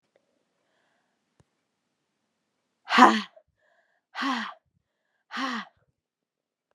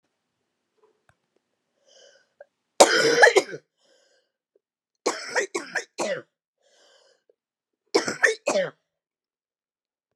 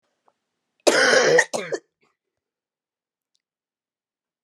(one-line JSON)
{"exhalation_length": "6.7 s", "exhalation_amplitude": 31873, "exhalation_signal_mean_std_ratio": 0.21, "three_cough_length": "10.2 s", "three_cough_amplitude": 32717, "three_cough_signal_mean_std_ratio": 0.28, "cough_length": "4.4 s", "cough_amplitude": 28208, "cough_signal_mean_std_ratio": 0.32, "survey_phase": "beta (2021-08-13 to 2022-03-07)", "age": "45-64", "gender": "Female", "wearing_mask": "No", "symptom_cough_any": true, "symptom_runny_or_blocked_nose": true, "symptom_sore_throat": true, "symptom_fatigue": true, "symptom_headache": true, "symptom_onset": "3 days", "smoker_status": "Never smoked", "respiratory_condition_asthma": false, "respiratory_condition_other": false, "recruitment_source": "Test and Trace", "submission_delay": "1 day", "covid_test_result": "Positive", "covid_test_method": "RT-qPCR", "covid_ct_value": 19.7, "covid_ct_gene": "ORF1ab gene"}